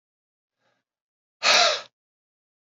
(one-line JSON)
{"exhalation_length": "2.6 s", "exhalation_amplitude": 20812, "exhalation_signal_mean_std_ratio": 0.29, "survey_phase": "beta (2021-08-13 to 2022-03-07)", "age": "45-64", "gender": "Male", "wearing_mask": "No", "symptom_cough_any": true, "symptom_runny_or_blocked_nose": true, "symptom_fever_high_temperature": true, "symptom_change_to_sense_of_smell_or_taste": true, "symptom_loss_of_taste": true, "symptom_other": true, "symptom_onset": "3 days", "smoker_status": "Never smoked", "respiratory_condition_asthma": false, "respiratory_condition_other": false, "recruitment_source": "Test and Trace", "submission_delay": "1 day", "covid_test_result": "Positive", "covid_test_method": "RT-qPCR", "covid_ct_value": 15.4, "covid_ct_gene": "ORF1ab gene", "covid_ct_mean": 15.9, "covid_viral_load": "6300000 copies/ml", "covid_viral_load_category": "High viral load (>1M copies/ml)"}